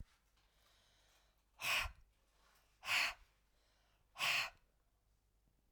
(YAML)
exhalation_length: 5.7 s
exhalation_amplitude: 2176
exhalation_signal_mean_std_ratio: 0.34
survey_phase: alpha (2021-03-01 to 2021-08-12)
age: 45-64
gender: Female
wearing_mask: 'No'
symptom_fatigue: true
symptom_headache: true
symptom_change_to_sense_of_smell_or_taste: true
symptom_loss_of_taste: true
smoker_status: Ex-smoker
respiratory_condition_asthma: false
respiratory_condition_other: false
recruitment_source: Test and Trace
submission_delay: 2 days
covid_test_result: Positive
covid_test_method: RT-qPCR
covid_ct_value: 22.6
covid_ct_gene: ORF1ab gene